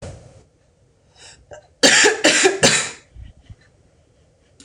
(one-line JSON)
{"three_cough_length": "4.6 s", "three_cough_amplitude": 26028, "three_cough_signal_mean_std_ratio": 0.38, "survey_phase": "beta (2021-08-13 to 2022-03-07)", "age": "18-44", "gender": "Female", "wearing_mask": "No", "symptom_new_continuous_cough": true, "symptom_runny_or_blocked_nose": true, "symptom_fatigue": true, "smoker_status": "Never smoked", "respiratory_condition_asthma": false, "respiratory_condition_other": false, "recruitment_source": "Test and Trace", "submission_delay": "2 days", "covid_test_result": "Positive", "covid_test_method": "ePCR"}